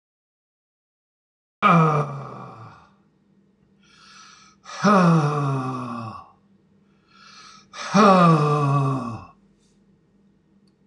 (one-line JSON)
{"exhalation_length": "10.9 s", "exhalation_amplitude": 24012, "exhalation_signal_mean_std_ratio": 0.44, "survey_phase": "alpha (2021-03-01 to 2021-08-12)", "age": "65+", "gender": "Male", "wearing_mask": "No", "symptom_none": true, "smoker_status": "Ex-smoker", "respiratory_condition_asthma": false, "respiratory_condition_other": false, "recruitment_source": "REACT", "submission_delay": "2 days", "covid_test_result": "Negative", "covid_test_method": "RT-qPCR"}